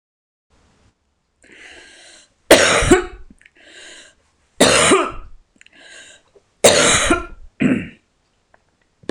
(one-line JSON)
{"three_cough_length": "9.1 s", "three_cough_amplitude": 26028, "three_cough_signal_mean_std_ratio": 0.37, "survey_phase": "beta (2021-08-13 to 2022-03-07)", "age": "45-64", "gender": "Female", "wearing_mask": "No", "symptom_none": true, "smoker_status": "Current smoker (1 to 10 cigarettes per day)", "respiratory_condition_asthma": false, "respiratory_condition_other": false, "recruitment_source": "REACT", "submission_delay": "3 days", "covid_test_result": "Negative", "covid_test_method": "RT-qPCR"}